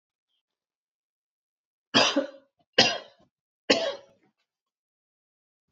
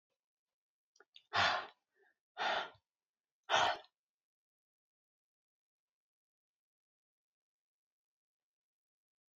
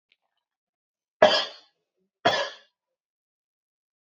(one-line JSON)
{"three_cough_length": "5.7 s", "three_cough_amplitude": 20171, "three_cough_signal_mean_std_ratio": 0.26, "exhalation_length": "9.4 s", "exhalation_amplitude": 3973, "exhalation_signal_mean_std_ratio": 0.23, "cough_length": "4.1 s", "cough_amplitude": 27379, "cough_signal_mean_std_ratio": 0.23, "survey_phase": "alpha (2021-03-01 to 2021-08-12)", "age": "45-64", "gender": "Female", "wearing_mask": "No", "symptom_none": true, "smoker_status": "Ex-smoker", "respiratory_condition_asthma": true, "respiratory_condition_other": false, "recruitment_source": "REACT", "submission_delay": "1 day", "covid_test_result": "Negative", "covid_test_method": "RT-qPCR"}